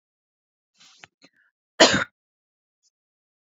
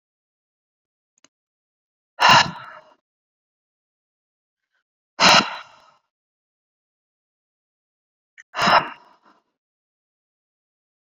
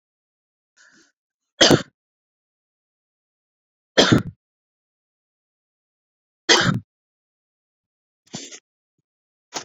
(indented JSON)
{
  "cough_length": "3.6 s",
  "cough_amplitude": 30872,
  "cough_signal_mean_std_ratio": 0.18,
  "exhalation_length": "11.0 s",
  "exhalation_amplitude": 30888,
  "exhalation_signal_mean_std_ratio": 0.22,
  "three_cough_length": "9.6 s",
  "three_cough_amplitude": 29922,
  "three_cough_signal_mean_std_ratio": 0.21,
  "survey_phase": "beta (2021-08-13 to 2022-03-07)",
  "age": "18-44",
  "gender": "Female",
  "wearing_mask": "No",
  "symptom_none": true,
  "smoker_status": "Ex-smoker",
  "respiratory_condition_asthma": false,
  "respiratory_condition_other": false,
  "recruitment_source": "REACT",
  "submission_delay": "1 day",
  "covid_test_result": "Negative",
  "covid_test_method": "RT-qPCR"
}